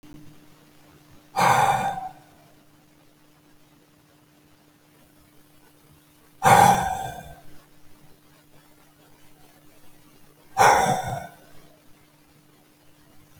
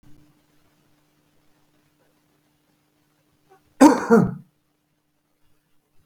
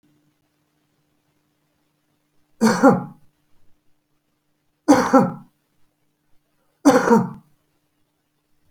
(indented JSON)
{
  "exhalation_length": "13.4 s",
  "exhalation_amplitude": 26145,
  "exhalation_signal_mean_std_ratio": 0.32,
  "cough_length": "6.1 s",
  "cough_amplitude": 28985,
  "cough_signal_mean_std_ratio": 0.2,
  "three_cough_length": "8.7 s",
  "three_cough_amplitude": 27626,
  "three_cough_signal_mean_std_ratio": 0.29,
  "survey_phase": "beta (2021-08-13 to 2022-03-07)",
  "age": "65+",
  "gender": "Male",
  "wearing_mask": "No",
  "symptom_none": true,
  "smoker_status": "Current smoker (e-cigarettes or vapes only)",
  "respiratory_condition_asthma": true,
  "respiratory_condition_other": false,
  "recruitment_source": "Test and Trace",
  "submission_delay": "2 days",
  "covid_test_result": "Positive",
  "covid_test_method": "RT-qPCR",
  "covid_ct_value": 24.5,
  "covid_ct_gene": "S gene",
  "covid_ct_mean": 24.9,
  "covid_viral_load": "6600 copies/ml",
  "covid_viral_load_category": "Minimal viral load (< 10K copies/ml)"
}